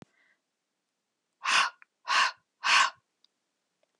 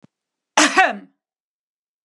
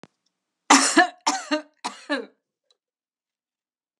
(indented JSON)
{
  "exhalation_length": "4.0 s",
  "exhalation_amplitude": 11062,
  "exhalation_signal_mean_std_ratio": 0.34,
  "cough_length": "2.0 s",
  "cough_amplitude": 32767,
  "cough_signal_mean_std_ratio": 0.3,
  "three_cough_length": "4.0 s",
  "three_cough_amplitude": 30704,
  "three_cough_signal_mean_std_ratio": 0.3,
  "survey_phase": "beta (2021-08-13 to 2022-03-07)",
  "age": "45-64",
  "gender": "Female",
  "wearing_mask": "No",
  "symptom_none": true,
  "smoker_status": "Never smoked",
  "respiratory_condition_asthma": false,
  "respiratory_condition_other": false,
  "recruitment_source": "REACT",
  "submission_delay": "2 days",
  "covid_test_result": "Negative",
  "covid_test_method": "RT-qPCR",
  "influenza_a_test_result": "Negative",
  "influenza_b_test_result": "Negative"
}